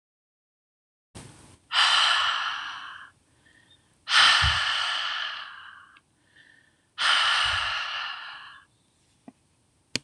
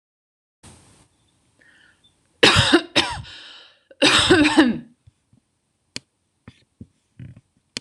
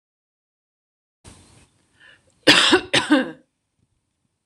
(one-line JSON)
{"exhalation_length": "10.0 s", "exhalation_amplitude": 17020, "exhalation_signal_mean_std_ratio": 0.48, "three_cough_length": "7.8 s", "three_cough_amplitude": 26028, "three_cough_signal_mean_std_ratio": 0.33, "cough_length": "4.5 s", "cough_amplitude": 26028, "cough_signal_mean_std_ratio": 0.29, "survey_phase": "beta (2021-08-13 to 2022-03-07)", "age": "18-44", "gender": "Female", "wearing_mask": "No", "symptom_none": true, "smoker_status": "Never smoked", "respiratory_condition_asthma": false, "respiratory_condition_other": false, "recruitment_source": "REACT", "submission_delay": "1 day", "covid_test_result": "Positive", "covid_test_method": "RT-qPCR", "covid_ct_value": 32.0, "covid_ct_gene": "N gene", "influenza_a_test_result": "Negative", "influenza_b_test_result": "Negative"}